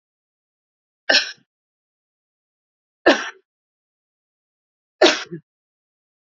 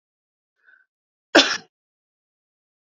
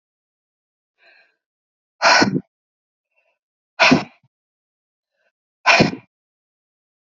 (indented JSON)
{
  "three_cough_length": "6.3 s",
  "three_cough_amplitude": 29024,
  "three_cough_signal_mean_std_ratio": 0.21,
  "cough_length": "2.8 s",
  "cough_amplitude": 28870,
  "cough_signal_mean_std_ratio": 0.18,
  "exhalation_length": "7.1 s",
  "exhalation_amplitude": 32767,
  "exhalation_signal_mean_std_ratio": 0.27,
  "survey_phase": "beta (2021-08-13 to 2022-03-07)",
  "age": "45-64",
  "gender": "Female",
  "wearing_mask": "No",
  "symptom_none": true,
  "smoker_status": "Ex-smoker",
  "respiratory_condition_asthma": false,
  "respiratory_condition_other": false,
  "recruitment_source": "REACT",
  "submission_delay": "2 days",
  "covid_test_result": "Negative",
  "covid_test_method": "RT-qPCR",
  "influenza_a_test_result": "Negative",
  "influenza_b_test_result": "Negative"
}